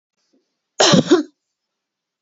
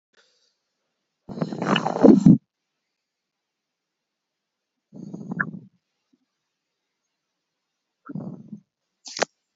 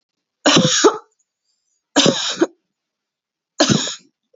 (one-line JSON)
{"cough_length": "2.2 s", "cough_amplitude": 27772, "cough_signal_mean_std_ratio": 0.33, "exhalation_length": "9.6 s", "exhalation_amplitude": 27919, "exhalation_signal_mean_std_ratio": 0.22, "three_cough_length": "4.4 s", "three_cough_amplitude": 32531, "three_cough_signal_mean_std_ratio": 0.41, "survey_phase": "beta (2021-08-13 to 2022-03-07)", "age": "18-44", "gender": "Female", "wearing_mask": "No", "symptom_none": true, "smoker_status": "Never smoked", "respiratory_condition_asthma": false, "respiratory_condition_other": false, "recruitment_source": "REACT", "submission_delay": "1 day", "covid_test_result": "Negative", "covid_test_method": "RT-qPCR", "influenza_a_test_result": "Negative", "influenza_b_test_result": "Negative"}